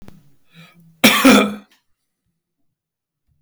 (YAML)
cough_length: 3.4 s
cough_amplitude: 32768
cough_signal_mean_std_ratio: 0.31
survey_phase: alpha (2021-03-01 to 2021-08-12)
age: 65+
gender: Male
wearing_mask: 'No'
symptom_none: true
smoker_status: Ex-smoker
respiratory_condition_asthma: false
respiratory_condition_other: false
recruitment_source: REACT
submission_delay: 2 days
covid_test_result: Negative
covid_test_method: RT-qPCR